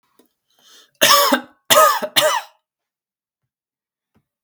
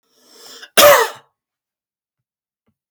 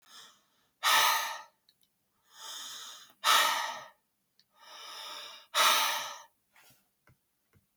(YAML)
three_cough_length: 4.4 s
three_cough_amplitude: 32768
three_cough_signal_mean_std_ratio: 0.37
cough_length: 2.9 s
cough_amplitude: 32768
cough_signal_mean_std_ratio: 0.28
exhalation_length: 7.8 s
exhalation_amplitude: 9302
exhalation_signal_mean_std_ratio: 0.4
survey_phase: beta (2021-08-13 to 2022-03-07)
age: 18-44
gender: Male
wearing_mask: 'No'
symptom_none: true
smoker_status: Never smoked
respiratory_condition_asthma: true
respiratory_condition_other: false
recruitment_source: Test and Trace
submission_delay: 1 day
covid_test_result: Negative
covid_test_method: RT-qPCR